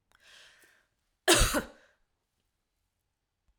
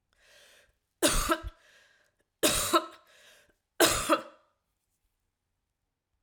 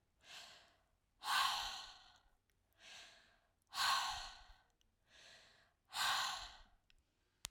{"cough_length": "3.6 s", "cough_amplitude": 14035, "cough_signal_mean_std_ratio": 0.24, "three_cough_length": "6.2 s", "three_cough_amplitude": 14724, "three_cough_signal_mean_std_ratio": 0.33, "exhalation_length": "7.5 s", "exhalation_amplitude": 4211, "exhalation_signal_mean_std_ratio": 0.41, "survey_phase": "alpha (2021-03-01 to 2021-08-12)", "age": "65+", "gender": "Female", "wearing_mask": "No", "symptom_none": true, "smoker_status": "Never smoked", "respiratory_condition_asthma": false, "respiratory_condition_other": false, "recruitment_source": "REACT", "submission_delay": "2 days", "covid_test_result": "Negative", "covid_test_method": "RT-qPCR"}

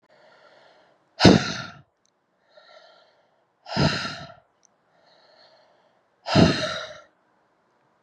{"exhalation_length": "8.0 s", "exhalation_amplitude": 32734, "exhalation_signal_mean_std_ratio": 0.27, "survey_phase": "beta (2021-08-13 to 2022-03-07)", "age": "18-44", "gender": "Female", "wearing_mask": "No", "symptom_cough_any": true, "symptom_runny_or_blocked_nose": true, "symptom_sore_throat": true, "symptom_headache": true, "symptom_onset": "5 days", "smoker_status": "Never smoked", "respiratory_condition_asthma": true, "respiratory_condition_other": false, "recruitment_source": "Test and Trace", "submission_delay": "2 days", "covid_test_result": "Positive", "covid_test_method": "RT-qPCR", "covid_ct_value": 22.8, "covid_ct_gene": "S gene", "covid_ct_mean": 22.9, "covid_viral_load": "30000 copies/ml", "covid_viral_load_category": "Low viral load (10K-1M copies/ml)"}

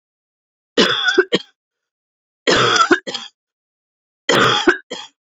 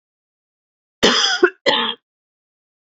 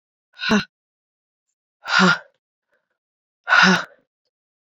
{"three_cough_length": "5.4 s", "three_cough_amplitude": 31100, "three_cough_signal_mean_std_ratio": 0.44, "cough_length": "3.0 s", "cough_amplitude": 29764, "cough_signal_mean_std_ratio": 0.37, "exhalation_length": "4.8 s", "exhalation_amplitude": 31049, "exhalation_signal_mean_std_ratio": 0.33, "survey_phase": "alpha (2021-03-01 to 2021-08-12)", "age": "45-64", "gender": "Female", "wearing_mask": "No", "symptom_cough_any": true, "symptom_fatigue": true, "symptom_fever_high_temperature": true, "symptom_onset": "4 days", "smoker_status": "Never smoked", "respiratory_condition_asthma": false, "respiratory_condition_other": false, "recruitment_source": "Test and Trace", "submission_delay": "2 days", "covid_test_result": "Positive", "covid_test_method": "RT-qPCR"}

